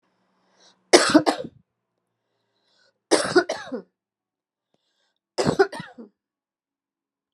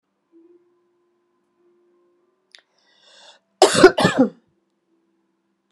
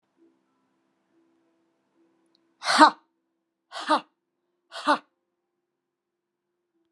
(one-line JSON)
{"three_cough_length": "7.3 s", "three_cough_amplitude": 32767, "three_cough_signal_mean_std_ratio": 0.26, "cough_length": "5.7 s", "cough_amplitude": 32768, "cough_signal_mean_std_ratio": 0.22, "exhalation_length": "6.9 s", "exhalation_amplitude": 28149, "exhalation_signal_mean_std_ratio": 0.19, "survey_phase": "beta (2021-08-13 to 2022-03-07)", "age": "65+", "gender": "Female", "wearing_mask": "No", "symptom_none": true, "smoker_status": "Ex-smoker", "respiratory_condition_asthma": false, "respiratory_condition_other": false, "recruitment_source": "REACT", "submission_delay": "1 day", "covid_test_result": "Negative", "covid_test_method": "RT-qPCR"}